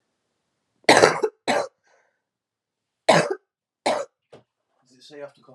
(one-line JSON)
{"cough_length": "5.5 s", "cough_amplitude": 32767, "cough_signal_mean_std_ratio": 0.3, "survey_phase": "alpha (2021-03-01 to 2021-08-12)", "age": "18-44", "gender": "Female", "wearing_mask": "No", "symptom_cough_any": true, "symptom_new_continuous_cough": true, "symptom_headache": true, "symptom_onset": "3 days", "smoker_status": "Never smoked", "respiratory_condition_asthma": false, "respiratory_condition_other": false, "recruitment_source": "Test and Trace", "submission_delay": "2 days", "covid_test_result": "Positive", "covid_test_method": "RT-qPCR"}